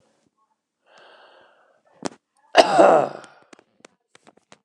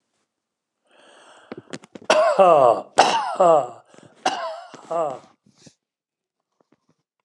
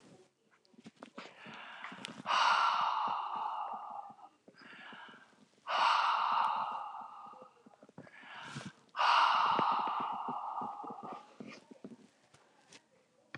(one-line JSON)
{"cough_length": "4.6 s", "cough_amplitude": 29204, "cough_signal_mean_std_ratio": 0.26, "three_cough_length": "7.2 s", "three_cough_amplitude": 29204, "three_cough_signal_mean_std_ratio": 0.38, "exhalation_length": "13.4 s", "exhalation_amplitude": 5263, "exhalation_signal_mean_std_ratio": 0.55, "survey_phase": "beta (2021-08-13 to 2022-03-07)", "age": "65+", "gender": "Male", "wearing_mask": "No", "symptom_cough_any": true, "smoker_status": "Ex-smoker", "respiratory_condition_asthma": true, "respiratory_condition_other": false, "recruitment_source": "REACT", "submission_delay": "10 days", "covid_test_result": "Negative", "covid_test_method": "RT-qPCR"}